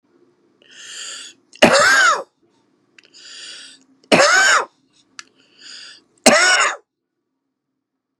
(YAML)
three_cough_length: 8.2 s
three_cough_amplitude: 32768
three_cough_signal_mean_std_ratio: 0.39
survey_phase: beta (2021-08-13 to 2022-03-07)
age: 65+
gender: Male
wearing_mask: 'No'
symptom_runny_or_blocked_nose: true
symptom_onset: 6 days
smoker_status: Never smoked
respiratory_condition_asthma: true
respiratory_condition_other: false
recruitment_source: REACT
submission_delay: 1 day
covid_test_result: Negative
covid_test_method: RT-qPCR
influenza_a_test_result: Negative
influenza_b_test_result: Negative